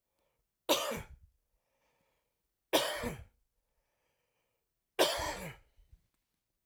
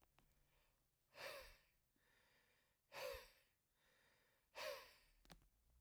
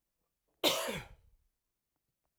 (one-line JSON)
{"three_cough_length": "6.7 s", "three_cough_amplitude": 7612, "three_cough_signal_mean_std_ratio": 0.31, "exhalation_length": "5.8 s", "exhalation_amplitude": 402, "exhalation_signal_mean_std_ratio": 0.41, "cough_length": "2.4 s", "cough_amplitude": 7070, "cough_signal_mean_std_ratio": 0.29, "survey_phase": "alpha (2021-03-01 to 2021-08-12)", "age": "45-64", "gender": "Male", "wearing_mask": "No", "symptom_none": true, "smoker_status": "Ex-smoker", "respiratory_condition_asthma": false, "respiratory_condition_other": false, "recruitment_source": "REACT", "submission_delay": "1 day", "covid_test_result": "Negative", "covid_test_method": "RT-qPCR"}